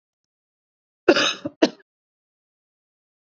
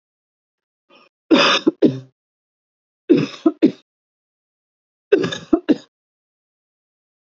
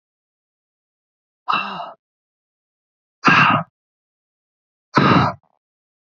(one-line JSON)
{"cough_length": "3.2 s", "cough_amplitude": 26738, "cough_signal_mean_std_ratio": 0.22, "three_cough_length": "7.3 s", "three_cough_amplitude": 28723, "three_cough_signal_mean_std_ratio": 0.3, "exhalation_length": "6.1 s", "exhalation_amplitude": 28215, "exhalation_signal_mean_std_ratio": 0.32, "survey_phase": "alpha (2021-03-01 to 2021-08-12)", "age": "45-64", "gender": "Female", "wearing_mask": "No", "symptom_none": true, "smoker_status": "Never smoked", "respiratory_condition_asthma": false, "respiratory_condition_other": false, "recruitment_source": "REACT", "submission_delay": "1 day", "covid_test_result": "Negative", "covid_test_method": "RT-qPCR"}